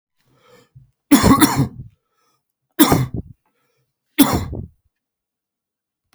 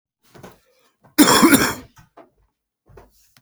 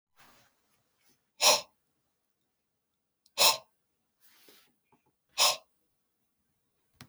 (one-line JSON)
{"three_cough_length": "6.1 s", "three_cough_amplitude": 32768, "three_cough_signal_mean_std_ratio": 0.33, "cough_length": "3.4 s", "cough_amplitude": 32768, "cough_signal_mean_std_ratio": 0.32, "exhalation_length": "7.1 s", "exhalation_amplitude": 13036, "exhalation_signal_mean_std_ratio": 0.22, "survey_phase": "beta (2021-08-13 to 2022-03-07)", "age": "45-64", "gender": "Male", "wearing_mask": "No", "symptom_cough_any": true, "symptom_new_continuous_cough": true, "symptom_runny_or_blocked_nose": true, "symptom_fatigue": true, "symptom_onset": "4 days", "smoker_status": "Never smoked", "respiratory_condition_asthma": false, "respiratory_condition_other": false, "recruitment_source": "Test and Trace", "submission_delay": "1 day", "covid_test_result": "Positive", "covid_test_method": "ePCR"}